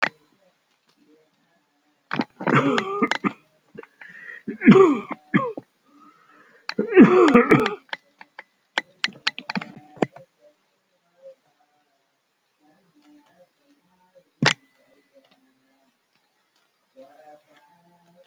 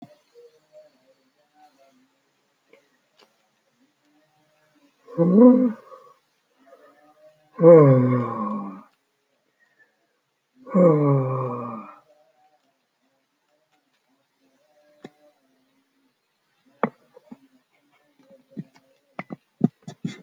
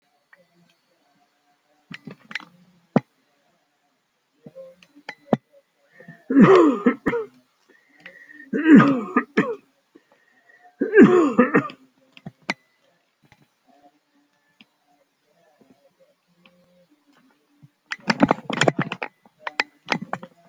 {"cough_length": "18.3 s", "cough_amplitude": 29435, "cough_signal_mean_std_ratio": 0.27, "exhalation_length": "20.2 s", "exhalation_amplitude": 26963, "exhalation_signal_mean_std_ratio": 0.27, "three_cough_length": "20.5 s", "three_cough_amplitude": 32767, "three_cough_signal_mean_std_ratio": 0.28, "survey_phase": "alpha (2021-03-01 to 2021-08-12)", "age": "65+", "gender": "Male", "wearing_mask": "No", "symptom_none": true, "smoker_status": "Never smoked", "respiratory_condition_asthma": false, "respiratory_condition_other": false, "recruitment_source": "REACT", "submission_delay": "1 day", "covid_test_result": "Negative", "covid_test_method": "RT-qPCR"}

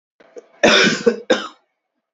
{"cough_length": "2.1 s", "cough_amplitude": 28647, "cough_signal_mean_std_ratio": 0.43, "survey_phase": "beta (2021-08-13 to 2022-03-07)", "age": "18-44", "gender": "Male", "wearing_mask": "No", "symptom_cough_any": true, "symptom_new_continuous_cough": true, "symptom_runny_or_blocked_nose": true, "symptom_shortness_of_breath": true, "symptom_sore_throat": true, "symptom_diarrhoea": true, "symptom_fatigue": true, "symptom_fever_high_temperature": true, "symptom_headache": true, "symptom_change_to_sense_of_smell_or_taste": true, "symptom_loss_of_taste": true, "symptom_onset": "2 days", "smoker_status": "Ex-smoker", "respiratory_condition_asthma": true, "respiratory_condition_other": false, "recruitment_source": "Test and Trace", "submission_delay": "2 days", "covid_test_result": "Positive", "covid_test_method": "RT-qPCR", "covid_ct_value": 16.8, "covid_ct_gene": "ORF1ab gene", "covid_ct_mean": 17.3, "covid_viral_load": "2200000 copies/ml", "covid_viral_load_category": "High viral load (>1M copies/ml)"}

